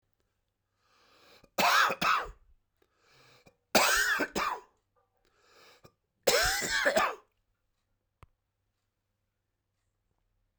{"three_cough_length": "10.6 s", "three_cough_amplitude": 13557, "three_cough_signal_mean_std_ratio": 0.37, "survey_phase": "beta (2021-08-13 to 2022-03-07)", "age": "45-64", "gender": "Male", "wearing_mask": "No", "symptom_cough_any": true, "symptom_runny_or_blocked_nose": true, "symptom_fatigue": true, "symptom_fever_high_temperature": true, "symptom_headache": true, "symptom_change_to_sense_of_smell_or_taste": true, "smoker_status": "Never smoked", "respiratory_condition_asthma": false, "respiratory_condition_other": false, "recruitment_source": "Test and Trace", "submission_delay": "2 days", "covid_test_result": "Positive", "covid_test_method": "LFT"}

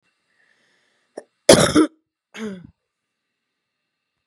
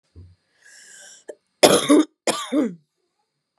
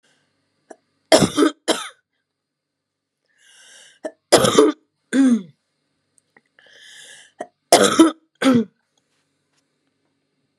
{"exhalation_length": "4.3 s", "exhalation_amplitude": 32768, "exhalation_signal_mean_std_ratio": 0.23, "cough_length": "3.6 s", "cough_amplitude": 32768, "cough_signal_mean_std_ratio": 0.34, "three_cough_length": "10.6 s", "three_cough_amplitude": 32768, "three_cough_signal_mean_std_ratio": 0.32, "survey_phase": "beta (2021-08-13 to 2022-03-07)", "age": "18-44", "gender": "Female", "wearing_mask": "No", "symptom_cough_any": true, "symptom_new_continuous_cough": true, "symptom_runny_or_blocked_nose": true, "symptom_shortness_of_breath": true, "symptom_sore_throat": true, "symptom_fatigue": true, "symptom_headache": true, "symptom_onset": "3 days", "smoker_status": "Ex-smoker", "respiratory_condition_asthma": false, "respiratory_condition_other": false, "recruitment_source": "Test and Trace", "submission_delay": "2 days", "covid_test_result": "Positive", "covid_test_method": "RT-qPCR", "covid_ct_value": 17.4, "covid_ct_gene": "ORF1ab gene", "covid_ct_mean": 18.5, "covid_viral_load": "830000 copies/ml", "covid_viral_load_category": "Low viral load (10K-1M copies/ml)"}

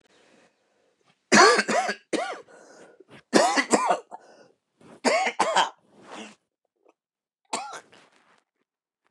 {"three_cough_length": "9.1 s", "three_cough_amplitude": 25789, "three_cough_signal_mean_std_ratio": 0.36, "survey_phase": "beta (2021-08-13 to 2022-03-07)", "age": "45-64", "gender": "Male", "wearing_mask": "No", "symptom_cough_any": true, "symptom_sore_throat": true, "symptom_diarrhoea": true, "symptom_fatigue": true, "symptom_fever_high_temperature": true, "symptom_headache": true, "symptom_other": true, "symptom_onset": "2 days", "smoker_status": "Never smoked", "respiratory_condition_asthma": false, "respiratory_condition_other": false, "recruitment_source": "Test and Trace", "submission_delay": "2 days", "covid_test_result": "Positive", "covid_test_method": "RT-qPCR", "covid_ct_value": 26.1, "covid_ct_gene": "ORF1ab gene"}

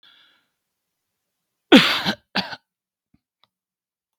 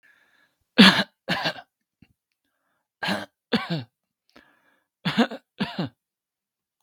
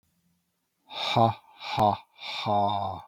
{"cough_length": "4.2 s", "cough_amplitude": 32768, "cough_signal_mean_std_ratio": 0.22, "three_cough_length": "6.8 s", "three_cough_amplitude": 32768, "three_cough_signal_mean_std_ratio": 0.27, "exhalation_length": "3.1 s", "exhalation_amplitude": 12420, "exhalation_signal_mean_std_ratio": 0.53, "survey_phase": "beta (2021-08-13 to 2022-03-07)", "age": "18-44", "gender": "Male", "wearing_mask": "No", "symptom_none": true, "smoker_status": "Never smoked", "respiratory_condition_asthma": false, "respiratory_condition_other": false, "recruitment_source": "REACT", "submission_delay": "2 days", "covid_test_result": "Negative", "covid_test_method": "RT-qPCR", "influenza_a_test_result": "Negative", "influenza_b_test_result": "Negative"}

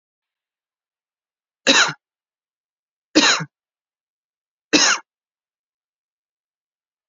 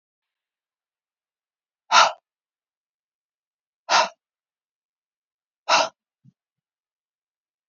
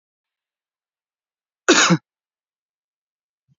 {"three_cough_length": "7.1 s", "three_cough_amplitude": 30587, "three_cough_signal_mean_std_ratio": 0.25, "exhalation_length": "7.7 s", "exhalation_amplitude": 26056, "exhalation_signal_mean_std_ratio": 0.2, "cough_length": "3.6 s", "cough_amplitude": 27652, "cough_signal_mean_std_ratio": 0.22, "survey_phase": "beta (2021-08-13 to 2022-03-07)", "age": "18-44", "gender": "Female", "wearing_mask": "No", "symptom_runny_or_blocked_nose": true, "symptom_sore_throat": true, "symptom_fatigue": true, "symptom_headache": true, "symptom_onset": "4 days", "smoker_status": "Ex-smoker", "respiratory_condition_asthma": false, "respiratory_condition_other": false, "recruitment_source": "Test and Trace", "submission_delay": "1 day", "covid_test_result": "Positive", "covid_test_method": "RT-qPCR", "covid_ct_value": 23.4, "covid_ct_gene": "ORF1ab gene"}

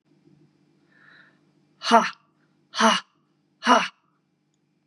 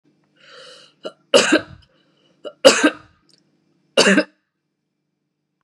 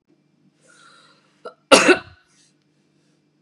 {"exhalation_length": "4.9 s", "exhalation_amplitude": 28936, "exhalation_signal_mean_std_ratio": 0.28, "three_cough_length": "5.6 s", "three_cough_amplitude": 32768, "three_cough_signal_mean_std_ratio": 0.29, "cough_length": "3.4 s", "cough_amplitude": 32768, "cough_signal_mean_std_ratio": 0.22, "survey_phase": "beta (2021-08-13 to 2022-03-07)", "age": "45-64", "gender": "Female", "wearing_mask": "No", "symptom_runny_or_blocked_nose": true, "symptom_onset": "12 days", "smoker_status": "Ex-smoker", "respiratory_condition_asthma": false, "respiratory_condition_other": false, "recruitment_source": "REACT", "submission_delay": "0 days", "covid_test_result": "Negative", "covid_test_method": "RT-qPCR", "influenza_a_test_result": "Negative", "influenza_b_test_result": "Negative"}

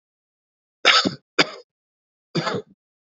{"three_cough_length": "3.2 s", "three_cough_amplitude": 29249, "three_cough_signal_mean_std_ratio": 0.3, "survey_phase": "beta (2021-08-13 to 2022-03-07)", "age": "18-44", "gender": "Male", "wearing_mask": "No", "symptom_none": true, "smoker_status": "Never smoked", "respiratory_condition_asthma": false, "respiratory_condition_other": false, "recruitment_source": "REACT", "submission_delay": "4 days", "covid_test_result": "Negative", "covid_test_method": "RT-qPCR"}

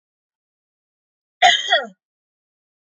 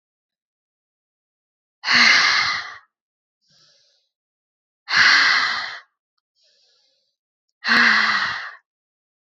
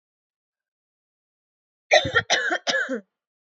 {"cough_length": "2.8 s", "cough_amplitude": 27635, "cough_signal_mean_std_ratio": 0.27, "exhalation_length": "9.3 s", "exhalation_amplitude": 25493, "exhalation_signal_mean_std_ratio": 0.4, "three_cough_length": "3.6 s", "three_cough_amplitude": 23855, "three_cough_signal_mean_std_ratio": 0.35, "survey_phase": "alpha (2021-03-01 to 2021-08-12)", "age": "18-44", "gender": "Female", "wearing_mask": "No", "symptom_none": true, "smoker_status": "Never smoked", "respiratory_condition_asthma": false, "respiratory_condition_other": true, "recruitment_source": "REACT", "submission_delay": "1 day", "covid_test_result": "Negative", "covid_test_method": "RT-qPCR"}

